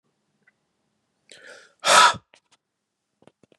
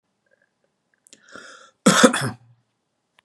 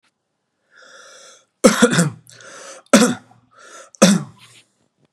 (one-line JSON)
{"exhalation_length": "3.6 s", "exhalation_amplitude": 28142, "exhalation_signal_mean_std_ratio": 0.23, "cough_length": "3.2 s", "cough_amplitude": 32767, "cough_signal_mean_std_ratio": 0.26, "three_cough_length": "5.1 s", "three_cough_amplitude": 32768, "three_cough_signal_mean_std_ratio": 0.33, "survey_phase": "beta (2021-08-13 to 2022-03-07)", "age": "45-64", "gender": "Male", "wearing_mask": "No", "symptom_none": true, "smoker_status": "Never smoked", "respiratory_condition_asthma": false, "respiratory_condition_other": false, "recruitment_source": "REACT", "submission_delay": "3 days", "covid_test_result": "Negative", "covid_test_method": "RT-qPCR", "influenza_a_test_result": "Negative", "influenza_b_test_result": "Negative"}